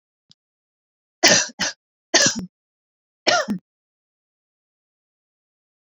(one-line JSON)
{"three_cough_length": "5.8 s", "three_cough_amplitude": 32767, "three_cough_signal_mean_std_ratio": 0.28, "survey_phase": "beta (2021-08-13 to 2022-03-07)", "age": "45-64", "gender": "Female", "wearing_mask": "No", "symptom_sore_throat": true, "symptom_abdominal_pain": true, "symptom_fatigue": true, "smoker_status": "Never smoked", "respiratory_condition_asthma": false, "respiratory_condition_other": false, "recruitment_source": "REACT", "submission_delay": "1 day", "covid_test_result": "Negative", "covid_test_method": "RT-qPCR"}